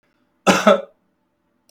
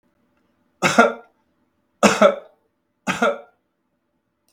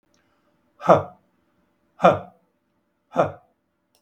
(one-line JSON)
{"cough_length": "1.7 s", "cough_amplitude": 32284, "cough_signal_mean_std_ratio": 0.32, "three_cough_length": "4.5 s", "three_cough_amplitude": 32423, "three_cough_signal_mean_std_ratio": 0.31, "exhalation_length": "4.0 s", "exhalation_amplitude": 32768, "exhalation_signal_mean_std_ratio": 0.24, "survey_phase": "beta (2021-08-13 to 2022-03-07)", "age": "65+", "gender": "Male", "wearing_mask": "No", "symptom_none": true, "smoker_status": "Never smoked", "respiratory_condition_asthma": false, "respiratory_condition_other": false, "recruitment_source": "REACT", "submission_delay": "1 day", "covid_test_result": "Negative", "covid_test_method": "RT-qPCR", "influenza_a_test_result": "Negative", "influenza_b_test_result": "Negative"}